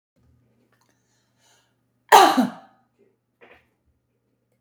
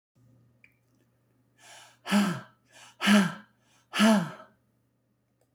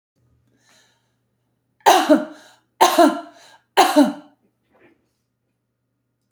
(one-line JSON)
{"cough_length": "4.6 s", "cough_amplitude": 29699, "cough_signal_mean_std_ratio": 0.21, "exhalation_length": "5.5 s", "exhalation_amplitude": 17219, "exhalation_signal_mean_std_ratio": 0.33, "three_cough_length": "6.3 s", "three_cough_amplitude": 31498, "three_cough_signal_mean_std_ratio": 0.32, "survey_phase": "beta (2021-08-13 to 2022-03-07)", "age": "65+", "gender": "Female", "wearing_mask": "No", "symptom_none": true, "smoker_status": "Never smoked", "respiratory_condition_asthma": false, "respiratory_condition_other": false, "recruitment_source": "REACT", "submission_delay": "0 days", "covid_test_result": "Negative", "covid_test_method": "RT-qPCR", "influenza_a_test_result": "Unknown/Void", "influenza_b_test_result": "Unknown/Void"}